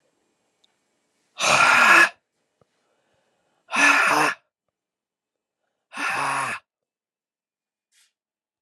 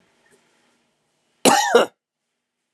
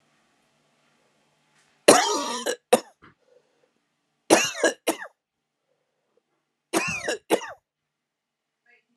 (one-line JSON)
{"exhalation_length": "8.6 s", "exhalation_amplitude": 25072, "exhalation_signal_mean_std_ratio": 0.36, "cough_length": "2.7 s", "cough_amplitude": 32767, "cough_signal_mean_std_ratio": 0.29, "three_cough_length": "9.0 s", "three_cough_amplitude": 32768, "three_cough_signal_mean_std_ratio": 0.28, "survey_phase": "beta (2021-08-13 to 2022-03-07)", "age": "45-64", "gender": "Male", "wearing_mask": "No", "symptom_cough_any": true, "symptom_new_continuous_cough": true, "symptom_runny_or_blocked_nose": true, "symptom_sore_throat": true, "symptom_fatigue": true, "symptom_headache": true, "smoker_status": "Ex-smoker", "respiratory_condition_asthma": true, "respiratory_condition_other": false, "recruitment_source": "Test and Trace", "submission_delay": "2 days", "covid_test_result": "Positive", "covid_test_method": "LFT"}